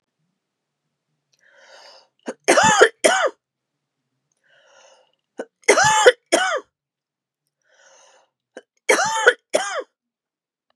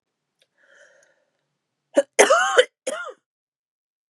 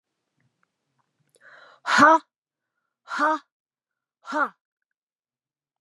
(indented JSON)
{
  "three_cough_length": "10.8 s",
  "three_cough_amplitude": 32768,
  "three_cough_signal_mean_std_ratio": 0.33,
  "cough_length": "4.1 s",
  "cough_amplitude": 32753,
  "cough_signal_mean_std_ratio": 0.28,
  "exhalation_length": "5.8 s",
  "exhalation_amplitude": 26460,
  "exhalation_signal_mean_std_ratio": 0.26,
  "survey_phase": "beta (2021-08-13 to 2022-03-07)",
  "age": "18-44",
  "gender": "Female",
  "wearing_mask": "No",
  "symptom_cough_any": true,
  "symptom_runny_or_blocked_nose": true,
  "symptom_fatigue": true,
  "symptom_other": true,
  "smoker_status": "Never smoked",
  "respiratory_condition_asthma": false,
  "respiratory_condition_other": false,
  "recruitment_source": "Test and Trace",
  "submission_delay": "2 days",
  "covid_test_result": "Positive",
  "covid_test_method": "RT-qPCR",
  "covid_ct_value": 24.2,
  "covid_ct_gene": "N gene"
}